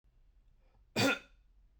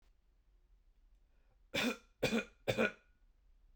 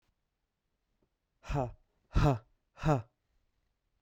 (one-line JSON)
{"cough_length": "1.8 s", "cough_amplitude": 4461, "cough_signal_mean_std_ratio": 0.31, "three_cough_length": "3.8 s", "three_cough_amplitude": 3927, "three_cough_signal_mean_std_ratio": 0.35, "exhalation_length": "4.0 s", "exhalation_amplitude": 6070, "exhalation_signal_mean_std_ratio": 0.3, "survey_phase": "beta (2021-08-13 to 2022-03-07)", "age": "18-44", "gender": "Male", "wearing_mask": "No", "symptom_sore_throat": true, "smoker_status": "Ex-smoker", "respiratory_condition_asthma": false, "respiratory_condition_other": false, "recruitment_source": "REACT", "submission_delay": "5 days", "covid_test_result": "Negative", "covid_test_method": "RT-qPCR"}